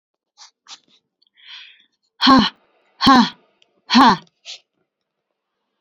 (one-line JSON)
{"exhalation_length": "5.8 s", "exhalation_amplitude": 30552, "exhalation_signal_mean_std_ratio": 0.31, "survey_phase": "beta (2021-08-13 to 2022-03-07)", "age": "18-44", "gender": "Female", "wearing_mask": "Yes", "symptom_none": true, "smoker_status": "Never smoked", "respiratory_condition_asthma": false, "respiratory_condition_other": false, "recruitment_source": "REACT", "submission_delay": "14 days", "covid_test_result": "Negative", "covid_test_method": "RT-qPCR"}